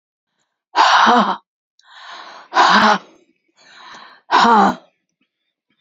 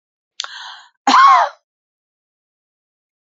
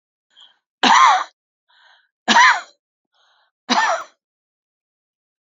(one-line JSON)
{"exhalation_length": "5.8 s", "exhalation_amplitude": 31601, "exhalation_signal_mean_std_ratio": 0.44, "cough_length": "3.3 s", "cough_amplitude": 28737, "cough_signal_mean_std_ratio": 0.31, "three_cough_length": "5.5 s", "three_cough_amplitude": 31080, "three_cough_signal_mean_std_ratio": 0.34, "survey_phase": "beta (2021-08-13 to 2022-03-07)", "age": "65+", "gender": "Female", "wearing_mask": "No", "symptom_none": true, "smoker_status": "Never smoked", "respiratory_condition_asthma": false, "respiratory_condition_other": false, "recruitment_source": "REACT", "submission_delay": "2 days", "covid_test_result": "Negative", "covid_test_method": "RT-qPCR", "influenza_a_test_result": "Negative", "influenza_b_test_result": "Negative"}